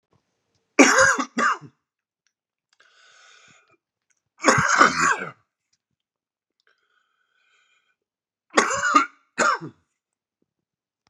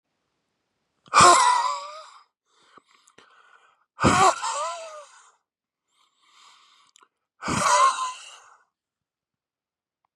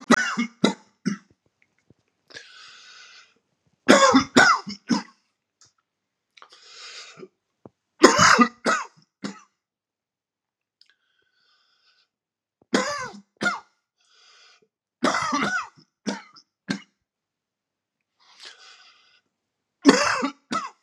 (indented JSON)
{
  "three_cough_length": "11.1 s",
  "three_cough_amplitude": 32647,
  "three_cough_signal_mean_std_ratio": 0.32,
  "exhalation_length": "10.2 s",
  "exhalation_amplitude": 25782,
  "exhalation_signal_mean_std_ratio": 0.34,
  "cough_length": "20.8 s",
  "cough_amplitude": 32767,
  "cough_signal_mean_std_ratio": 0.3,
  "survey_phase": "beta (2021-08-13 to 2022-03-07)",
  "age": "45-64",
  "gender": "Male",
  "wearing_mask": "No",
  "symptom_cough_any": true,
  "symptom_fatigue": true,
  "symptom_onset": "9 days",
  "smoker_status": "Ex-smoker",
  "respiratory_condition_asthma": false,
  "respiratory_condition_other": false,
  "recruitment_source": "REACT",
  "submission_delay": "3 days",
  "covid_test_result": "Positive",
  "covid_test_method": "RT-qPCR",
  "covid_ct_value": 22.0,
  "covid_ct_gene": "E gene",
  "influenza_a_test_result": "Negative",
  "influenza_b_test_result": "Negative"
}